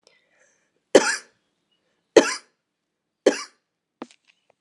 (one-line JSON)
{"cough_length": "4.6 s", "cough_amplitude": 32767, "cough_signal_mean_std_ratio": 0.2, "survey_phase": "alpha (2021-03-01 to 2021-08-12)", "age": "45-64", "gender": "Female", "wearing_mask": "No", "symptom_change_to_sense_of_smell_or_taste": true, "symptom_onset": "4 days", "smoker_status": "Never smoked", "respiratory_condition_asthma": false, "respiratory_condition_other": false, "recruitment_source": "Test and Trace", "submission_delay": "1 day", "covid_test_result": "Positive", "covid_test_method": "RT-qPCR", "covid_ct_value": 13.6, "covid_ct_gene": "ORF1ab gene", "covid_ct_mean": 14.0, "covid_viral_load": "25000000 copies/ml", "covid_viral_load_category": "High viral load (>1M copies/ml)"}